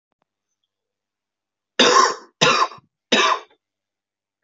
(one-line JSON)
{"three_cough_length": "4.4 s", "three_cough_amplitude": 28066, "three_cough_signal_mean_std_ratio": 0.36, "survey_phase": "beta (2021-08-13 to 2022-03-07)", "age": "18-44", "gender": "Male", "wearing_mask": "No", "symptom_change_to_sense_of_smell_or_taste": true, "smoker_status": "Current smoker (e-cigarettes or vapes only)", "respiratory_condition_asthma": false, "respiratory_condition_other": false, "recruitment_source": "Test and Trace", "submission_delay": "1 day", "covid_test_result": "Positive", "covid_test_method": "RT-qPCR", "covid_ct_value": 20.7, "covid_ct_gene": "ORF1ab gene", "covid_ct_mean": 21.3, "covid_viral_load": "100000 copies/ml", "covid_viral_load_category": "Low viral load (10K-1M copies/ml)"}